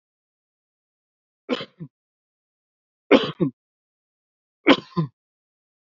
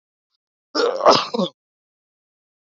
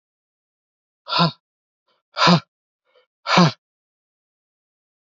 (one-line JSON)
{"three_cough_length": "5.9 s", "three_cough_amplitude": 27830, "three_cough_signal_mean_std_ratio": 0.21, "cough_length": "2.6 s", "cough_amplitude": 27776, "cough_signal_mean_std_ratio": 0.34, "exhalation_length": "5.1 s", "exhalation_amplitude": 32518, "exhalation_signal_mean_std_ratio": 0.27, "survey_phase": "beta (2021-08-13 to 2022-03-07)", "age": "45-64", "gender": "Male", "wearing_mask": "No", "symptom_none": true, "symptom_onset": "12 days", "smoker_status": "Ex-smoker", "respiratory_condition_asthma": false, "respiratory_condition_other": false, "recruitment_source": "REACT", "submission_delay": "0 days", "covid_test_result": "Negative", "covid_test_method": "RT-qPCR"}